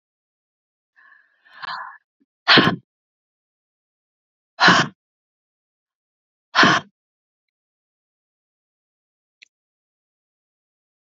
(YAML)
exhalation_length: 11.0 s
exhalation_amplitude: 30223
exhalation_signal_mean_std_ratio: 0.21
survey_phase: beta (2021-08-13 to 2022-03-07)
age: 45-64
gender: Female
wearing_mask: 'Yes'
symptom_none: true
smoker_status: Never smoked
respiratory_condition_asthma: false
respiratory_condition_other: false
recruitment_source: REACT
submission_delay: 1 day
covid_test_result: Negative
covid_test_method: RT-qPCR